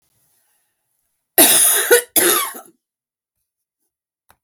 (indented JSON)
{
  "cough_length": "4.4 s",
  "cough_amplitude": 32768,
  "cough_signal_mean_std_ratio": 0.37,
  "survey_phase": "beta (2021-08-13 to 2022-03-07)",
  "age": "45-64",
  "gender": "Female",
  "wearing_mask": "No",
  "symptom_runny_or_blocked_nose": true,
  "symptom_abdominal_pain": true,
  "symptom_fatigue": true,
  "symptom_other": true,
  "smoker_status": "Never smoked",
  "respiratory_condition_asthma": true,
  "respiratory_condition_other": false,
  "recruitment_source": "REACT",
  "submission_delay": "1 day",
  "covid_test_result": "Negative",
  "covid_test_method": "RT-qPCR",
  "influenza_a_test_result": "Unknown/Void",
  "influenza_b_test_result": "Unknown/Void"
}